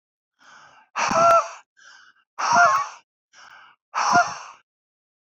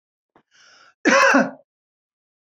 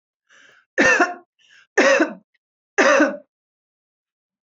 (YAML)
exhalation_length: 5.4 s
exhalation_amplitude: 18649
exhalation_signal_mean_std_ratio: 0.41
cough_length: 2.6 s
cough_amplitude: 24025
cough_signal_mean_std_ratio: 0.34
three_cough_length: 4.4 s
three_cough_amplitude: 26424
three_cough_signal_mean_std_ratio: 0.4
survey_phase: beta (2021-08-13 to 2022-03-07)
age: 45-64
gender: Female
wearing_mask: 'No'
symptom_fatigue: true
smoker_status: Never smoked
respiratory_condition_asthma: false
respiratory_condition_other: false
recruitment_source: REACT
submission_delay: 9 days
covid_test_result: Negative
covid_test_method: RT-qPCR